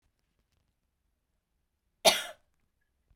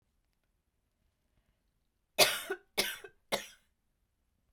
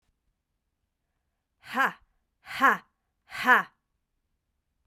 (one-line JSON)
{"cough_length": "3.2 s", "cough_amplitude": 14988, "cough_signal_mean_std_ratio": 0.16, "three_cough_length": "4.5 s", "three_cough_amplitude": 13104, "three_cough_signal_mean_std_ratio": 0.24, "exhalation_length": "4.9 s", "exhalation_amplitude": 16183, "exhalation_signal_mean_std_ratio": 0.26, "survey_phase": "beta (2021-08-13 to 2022-03-07)", "age": "18-44", "gender": "Female", "wearing_mask": "No", "symptom_cough_any": true, "symptom_new_continuous_cough": true, "symptom_runny_or_blocked_nose": true, "symptom_sore_throat": true, "symptom_fatigue": true, "symptom_headache": true, "smoker_status": "Never smoked", "respiratory_condition_asthma": false, "respiratory_condition_other": false, "recruitment_source": "Test and Trace", "submission_delay": "2 days", "covid_test_result": "Positive", "covid_test_method": "LFT"}